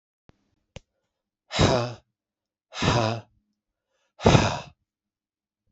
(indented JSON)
{
  "exhalation_length": "5.7 s",
  "exhalation_amplitude": 32767,
  "exhalation_signal_mean_std_ratio": 0.32,
  "survey_phase": "beta (2021-08-13 to 2022-03-07)",
  "age": "18-44",
  "gender": "Male",
  "wearing_mask": "No",
  "symptom_runny_or_blocked_nose": true,
  "symptom_loss_of_taste": true,
  "smoker_status": "Never smoked",
  "respiratory_condition_asthma": false,
  "respiratory_condition_other": false,
  "recruitment_source": "Test and Trace",
  "submission_delay": "2 days",
  "covid_test_result": "Positive",
  "covid_test_method": "RT-qPCR",
  "covid_ct_value": 18.9,
  "covid_ct_gene": "ORF1ab gene",
  "covid_ct_mean": 20.4,
  "covid_viral_load": "200000 copies/ml",
  "covid_viral_load_category": "Low viral load (10K-1M copies/ml)"
}